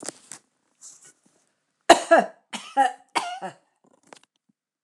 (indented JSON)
{
  "three_cough_length": "4.8 s",
  "three_cough_amplitude": 29204,
  "three_cough_signal_mean_std_ratio": 0.25,
  "survey_phase": "alpha (2021-03-01 to 2021-08-12)",
  "age": "65+",
  "gender": "Female",
  "wearing_mask": "No",
  "symptom_none": true,
  "smoker_status": "Ex-smoker",
  "respiratory_condition_asthma": false,
  "respiratory_condition_other": true,
  "recruitment_source": "REACT",
  "submission_delay": "4 days",
  "covid_test_result": "Negative",
  "covid_test_method": "RT-qPCR"
}